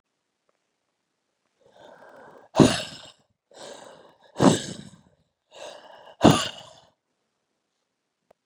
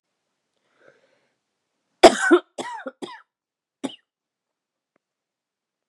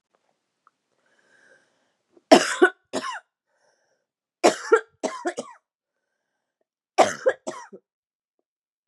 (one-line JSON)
{"exhalation_length": "8.5 s", "exhalation_amplitude": 28091, "exhalation_signal_mean_std_ratio": 0.22, "cough_length": "5.9 s", "cough_amplitude": 32768, "cough_signal_mean_std_ratio": 0.18, "three_cough_length": "8.9 s", "three_cough_amplitude": 32192, "three_cough_signal_mean_std_ratio": 0.24, "survey_phase": "beta (2021-08-13 to 2022-03-07)", "age": "18-44", "gender": "Female", "wearing_mask": "No", "symptom_cough_any": true, "symptom_runny_or_blocked_nose": true, "symptom_shortness_of_breath": true, "symptom_fatigue": true, "symptom_headache": true, "smoker_status": "Never smoked", "respiratory_condition_asthma": false, "respiratory_condition_other": false, "recruitment_source": "Test and Trace", "submission_delay": "1 day", "covid_test_result": "Positive", "covid_test_method": "LFT"}